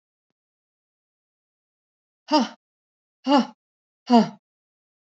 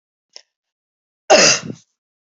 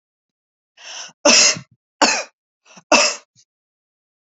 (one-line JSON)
{"exhalation_length": "5.1 s", "exhalation_amplitude": 19746, "exhalation_signal_mean_std_ratio": 0.25, "cough_length": "2.4 s", "cough_amplitude": 31617, "cough_signal_mean_std_ratio": 0.29, "three_cough_length": "4.3 s", "three_cough_amplitude": 32083, "three_cough_signal_mean_std_ratio": 0.34, "survey_phase": "alpha (2021-03-01 to 2021-08-12)", "age": "45-64", "gender": "Female", "wearing_mask": "No", "symptom_none": true, "smoker_status": "Never smoked", "respiratory_condition_asthma": false, "respiratory_condition_other": false, "recruitment_source": "REACT", "submission_delay": "2 days", "covid_test_result": "Negative", "covid_test_method": "RT-qPCR"}